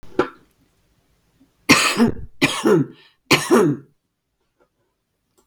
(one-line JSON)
{"three_cough_length": "5.5 s", "three_cough_amplitude": 32768, "three_cough_signal_mean_std_ratio": 0.4, "survey_phase": "beta (2021-08-13 to 2022-03-07)", "age": "65+", "gender": "Female", "wearing_mask": "No", "symptom_none": true, "smoker_status": "Never smoked", "respiratory_condition_asthma": false, "respiratory_condition_other": false, "recruitment_source": "REACT", "submission_delay": "1 day", "covid_test_result": "Negative", "covid_test_method": "RT-qPCR"}